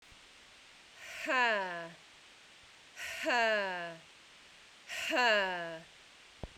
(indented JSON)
{
  "exhalation_length": "6.6 s",
  "exhalation_amplitude": 3791,
  "exhalation_signal_mean_std_ratio": 0.54,
  "survey_phase": "beta (2021-08-13 to 2022-03-07)",
  "age": "18-44",
  "gender": "Female",
  "wearing_mask": "No",
  "symptom_cough_any": true,
  "symptom_runny_or_blocked_nose": true,
  "symptom_shortness_of_breath": true,
  "symptom_change_to_sense_of_smell_or_taste": true,
  "symptom_loss_of_taste": true,
  "symptom_other": true,
  "symptom_onset": "8 days",
  "smoker_status": "Prefer not to say",
  "respiratory_condition_asthma": false,
  "respiratory_condition_other": false,
  "recruitment_source": "REACT",
  "submission_delay": "1 day",
  "covid_test_result": "Positive",
  "covid_test_method": "RT-qPCR",
  "covid_ct_value": 31.0,
  "covid_ct_gene": "N gene"
}